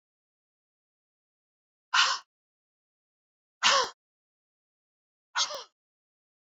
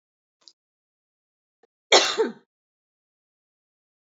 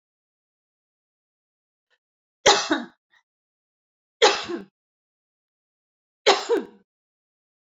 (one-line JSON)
{"exhalation_length": "6.5 s", "exhalation_amplitude": 13322, "exhalation_signal_mean_std_ratio": 0.24, "cough_length": "4.2 s", "cough_amplitude": 26475, "cough_signal_mean_std_ratio": 0.2, "three_cough_length": "7.7 s", "three_cough_amplitude": 26177, "three_cough_signal_mean_std_ratio": 0.24, "survey_phase": "beta (2021-08-13 to 2022-03-07)", "age": "45-64", "gender": "Female", "wearing_mask": "No", "symptom_cough_any": true, "symptom_sore_throat": true, "smoker_status": "Never smoked", "respiratory_condition_asthma": false, "respiratory_condition_other": false, "recruitment_source": "REACT", "submission_delay": "1 day", "covid_test_result": "Negative", "covid_test_method": "RT-qPCR"}